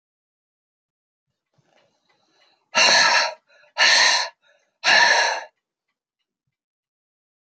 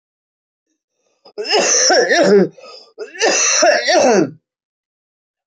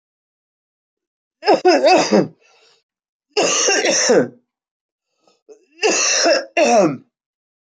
{"exhalation_length": "7.5 s", "exhalation_amplitude": 23528, "exhalation_signal_mean_std_ratio": 0.38, "cough_length": "5.5 s", "cough_amplitude": 28409, "cough_signal_mean_std_ratio": 0.57, "three_cough_length": "7.8 s", "three_cough_amplitude": 27259, "three_cough_signal_mean_std_ratio": 0.5, "survey_phase": "beta (2021-08-13 to 2022-03-07)", "age": "45-64", "gender": "Female", "wearing_mask": "No", "symptom_cough_any": true, "symptom_runny_or_blocked_nose": true, "symptom_sore_throat": true, "symptom_fatigue": true, "symptom_other": true, "symptom_onset": "3 days", "smoker_status": "Never smoked", "respiratory_condition_asthma": false, "respiratory_condition_other": false, "recruitment_source": "Test and Trace", "submission_delay": "2 days", "covid_test_result": "Positive", "covid_test_method": "RT-qPCR", "covid_ct_value": 11.5, "covid_ct_gene": "ORF1ab gene", "covid_ct_mean": 11.9, "covid_viral_load": "130000000 copies/ml", "covid_viral_load_category": "High viral load (>1M copies/ml)"}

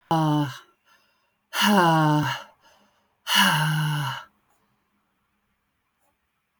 {"exhalation_length": "6.6 s", "exhalation_amplitude": 20989, "exhalation_signal_mean_std_ratio": 0.5, "survey_phase": "beta (2021-08-13 to 2022-03-07)", "age": "45-64", "gender": "Female", "wearing_mask": "No", "symptom_cough_any": true, "symptom_runny_or_blocked_nose": true, "symptom_diarrhoea": true, "symptom_fatigue": true, "symptom_onset": "8 days", "smoker_status": "Never smoked", "respiratory_condition_asthma": false, "respiratory_condition_other": false, "recruitment_source": "REACT", "submission_delay": "2 days", "covid_test_result": "Negative", "covid_test_method": "RT-qPCR"}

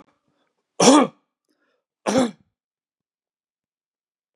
{"three_cough_length": "4.4 s", "three_cough_amplitude": 31858, "three_cough_signal_mean_std_ratio": 0.25, "survey_phase": "beta (2021-08-13 to 2022-03-07)", "age": "45-64", "gender": "Male", "wearing_mask": "No", "symptom_none": true, "symptom_onset": "3 days", "smoker_status": "Ex-smoker", "respiratory_condition_asthma": false, "respiratory_condition_other": false, "recruitment_source": "Test and Trace", "submission_delay": "1 day", "covid_test_result": "Negative", "covid_test_method": "RT-qPCR"}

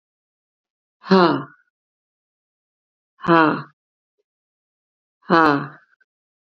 {"exhalation_length": "6.5 s", "exhalation_amplitude": 32767, "exhalation_signal_mean_std_ratio": 0.27, "survey_phase": "beta (2021-08-13 to 2022-03-07)", "age": "65+", "gender": "Female", "wearing_mask": "No", "symptom_none": true, "smoker_status": "Never smoked", "respiratory_condition_asthma": false, "respiratory_condition_other": false, "recruitment_source": "REACT", "submission_delay": "1 day", "covid_test_result": "Negative", "covid_test_method": "RT-qPCR", "influenza_a_test_result": "Negative", "influenza_b_test_result": "Negative"}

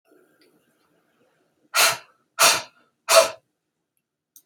{"exhalation_length": "4.5 s", "exhalation_amplitude": 31356, "exhalation_signal_mean_std_ratio": 0.29, "survey_phase": "beta (2021-08-13 to 2022-03-07)", "age": "18-44", "gender": "Female", "wearing_mask": "No", "symptom_abdominal_pain": true, "symptom_diarrhoea": true, "symptom_fatigue": true, "symptom_fever_high_temperature": true, "symptom_onset": "3 days", "smoker_status": "Never smoked", "respiratory_condition_asthma": false, "respiratory_condition_other": false, "recruitment_source": "Test and Trace", "submission_delay": "1 day", "covid_test_result": "Negative", "covid_test_method": "RT-qPCR"}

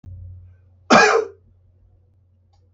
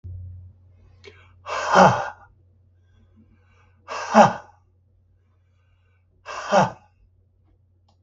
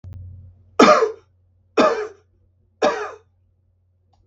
{"cough_length": "2.7 s", "cough_amplitude": 32766, "cough_signal_mean_std_ratio": 0.31, "exhalation_length": "8.0 s", "exhalation_amplitude": 32766, "exhalation_signal_mean_std_ratio": 0.28, "three_cough_length": "4.3 s", "three_cough_amplitude": 32768, "three_cough_signal_mean_std_ratio": 0.34, "survey_phase": "beta (2021-08-13 to 2022-03-07)", "age": "65+", "gender": "Male", "wearing_mask": "No", "symptom_sore_throat": true, "smoker_status": "Ex-smoker", "respiratory_condition_asthma": false, "respiratory_condition_other": false, "recruitment_source": "Test and Trace", "submission_delay": "1 day", "covid_test_result": "Negative", "covid_test_method": "RT-qPCR"}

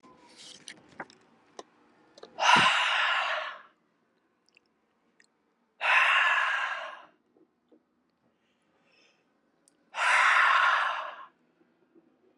{"exhalation_length": "12.4 s", "exhalation_amplitude": 13907, "exhalation_signal_mean_std_ratio": 0.43, "survey_phase": "beta (2021-08-13 to 2022-03-07)", "age": "18-44", "gender": "Male", "wearing_mask": "No", "symptom_runny_or_blocked_nose": true, "symptom_onset": "4 days", "smoker_status": "Never smoked", "respiratory_condition_asthma": false, "respiratory_condition_other": false, "recruitment_source": "Test and Trace", "submission_delay": "2 days", "covid_test_result": "Positive", "covid_test_method": "RT-qPCR", "covid_ct_value": 16.6, "covid_ct_gene": "N gene", "covid_ct_mean": 17.5, "covid_viral_load": "1800000 copies/ml", "covid_viral_load_category": "High viral load (>1M copies/ml)"}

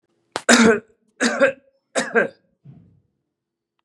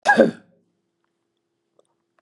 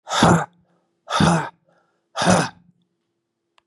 {"three_cough_length": "3.8 s", "three_cough_amplitude": 32767, "three_cough_signal_mean_std_ratio": 0.36, "cough_length": "2.2 s", "cough_amplitude": 32253, "cough_signal_mean_std_ratio": 0.25, "exhalation_length": "3.7 s", "exhalation_amplitude": 25944, "exhalation_signal_mean_std_ratio": 0.42, "survey_phase": "beta (2021-08-13 to 2022-03-07)", "age": "45-64", "gender": "Male", "wearing_mask": "No", "symptom_cough_any": true, "symptom_runny_or_blocked_nose": true, "symptom_fatigue": true, "symptom_headache": true, "symptom_onset": "4 days", "smoker_status": "Never smoked", "respiratory_condition_asthma": false, "respiratory_condition_other": false, "recruitment_source": "REACT", "submission_delay": "2 days", "covid_test_result": "Negative", "covid_test_method": "RT-qPCR"}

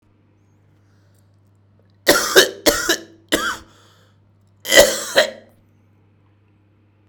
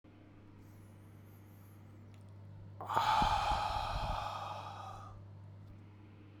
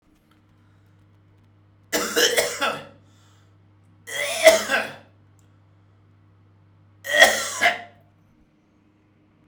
{"cough_length": "7.1 s", "cough_amplitude": 32768, "cough_signal_mean_std_ratio": 0.32, "exhalation_length": "6.4 s", "exhalation_amplitude": 5894, "exhalation_signal_mean_std_ratio": 0.58, "three_cough_length": "9.5 s", "three_cough_amplitude": 32768, "three_cough_signal_mean_std_ratio": 0.33, "survey_phase": "beta (2021-08-13 to 2022-03-07)", "age": "18-44", "gender": "Male", "wearing_mask": "No", "symptom_none": true, "smoker_status": "Ex-smoker", "respiratory_condition_asthma": false, "respiratory_condition_other": false, "recruitment_source": "REACT", "submission_delay": "2 days", "covid_test_result": "Negative", "covid_test_method": "RT-qPCR"}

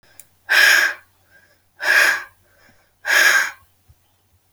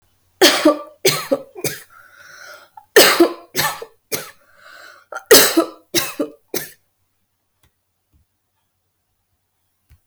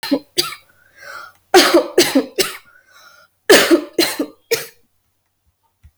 {"exhalation_length": "4.5 s", "exhalation_amplitude": 31598, "exhalation_signal_mean_std_ratio": 0.45, "three_cough_length": "10.1 s", "three_cough_amplitude": 32768, "three_cough_signal_mean_std_ratio": 0.33, "cough_length": "6.0 s", "cough_amplitude": 32768, "cough_signal_mean_std_ratio": 0.4, "survey_phase": "alpha (2021-03-01 to 2021-08-12)", "age": "18-44", "gender": "Female", "wearing_mask": "No", "symptom_none": true, "smoker_status": "Never smoked", "respiratory_condition_asthma": false, "respiratory_condition_other": false, "recruitment_source": "REACT", "submission_delay": "2 days", "covid_test_result": "Negative", "covid_test_method": "RT-qPCR"}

